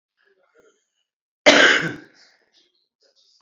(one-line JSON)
{"cough_length": "3.4 s", "cough_amplitude": 28897, "cough_signal_mean_std_ratio": 0.27, "survey_phase": "beta (2021-08-13 to 2022-03-07)", "age": "45-64", "gender": "Female", "wearing_mask": "No", "symptom_none": true, "smoker_status": "Current smoker (11 or more cigarettes per day)", "respiratory_condition_asthma": false, "respiratory_condition_other": false, "recruitment_source": "REACT", "submission_delay": "10 days", "covid_test_result": "Negative", "covid_test_method": "RT-qPCR"}